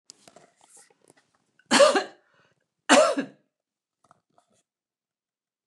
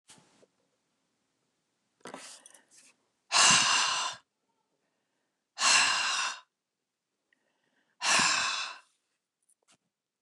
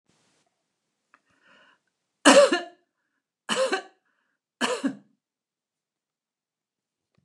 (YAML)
cough_length: 5.7 s
cough_amplitude: 20445
cough_signal_mean_std_ratio: 0.26
exhalation_length: 10.2 s
exhalation_amplitude: 12276
exhalation_signal_mean_std_ratio: 0.37
three_cough_length: 7.2 s
three_cough_amplitude: 28588
three_cough_signal_mean_std_ratio: 0.24
survey_phase: alpha (2021-03-01 to 2021-08-12)
age: 65+
gender: Female
wearing_mask: 'No'
symptom_none: true
smoker_status: Ex-smoker
respiratory_condition_asthma: false
respiratory_condition_other: false
recruitment_source: REACT
submission_delay: 1 day
covid_test_result: Negative
covid_test_method: RT-qPCR